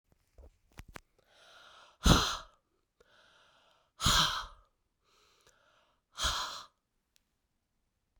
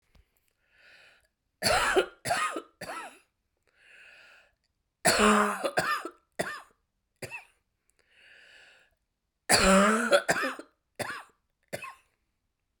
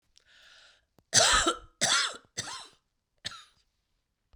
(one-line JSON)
{"exhalation_length": "8.2 s", "exhalation_amplitude": 10420, "exhalation_signal_mean_std_ratio": 0.27, "three_cough_length": "12.8 s", "three_cough_amplitude": 18480, "three_cough_signal_mean_std_ratio": 0.38, "cough_length": "4.4 s", "cough_amplitude": 16521, "cough_signal_mean_std_ratio": 0.36, "survey_phase": "beta (2021-08-13 to 2022-03-07)", "age": "45-64", "gender": "Female", "wearing_mask": "No", "symptom_cough_any": true, "symptom_runny_or_blocked_nose": true, "symptom_change_to_sense_of_smell_or_taste": true, "symptom_onset": "5 days", "smoker_status": "Never smoked", "respiratory_condition_asthma": false, "respiratory_condition_other": false, "recruitment_source": "Test and Trace", "submission_delay": "3 days", "covid_test_result": "Positive", "covid_test_method": "RT-qPCR"}